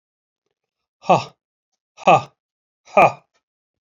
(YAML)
exhalation_length: 3.8 s
exhalation_amplitude: 28081
exhalation_signal_mean_std_ratio: 0.25
survey_phase: beta (2021-08-13 to 2022-03-07)
age: 45-64
gender: Male
wearing_mask: 'No'
symptom_runny_or_blocked_nose: true
symptom_onset: 11 days
smoker_status: Never smoked
respiratory_condition_asthma: true
respiratory_condition_other: false
recruitment_source: REACT
submission_delay: 2 days
covid_test_result: Negative
covid_test_method: RT-qPCR
influenza_a_test_result: Unknown/Void
influenza_b_test_result: Unknown/Void